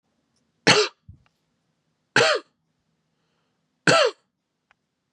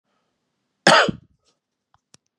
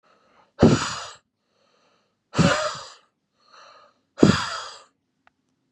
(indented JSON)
{
  "three_cough_length": "5.1 s",
  "three_cough_amplitude": 25025,
  "three_cough_signal_mean_std_ratio": 0.29,
  "cough_length": "2.4 s",
  "cough_amplitude": 32701,
  "cough_signal_mean_std_ratio": 0.25,
  "exhalation_length": "5.7 s",
  "exhalation_amplitude": 32662,
  "exhalation_signal_mean_std_ratio": 0.31,
  "survey_phase": "beta (2021-08-13 to 2022-03-07)",
  "age": "45-64",
  "gender": "Male",
  "wearing_mask": "No",
  "symptom_sore_throat": true,
  "symptom_diarrhoea": true,
  "symptom_fatigue": true,
  "smoker_status": "Never smoked",
  "respiratory_condition_asthma": false,
  "respiratory_condition_other": false,
  "recruitment_source": "REACT",
  "submission_delay": "1 day",
  "covid_test_result": "Negative",
  "covid_test_method": "RT-qPCR",
  "influenza_a_test_result": "Negative",
  "influenza_b_test_result": "Negative"
}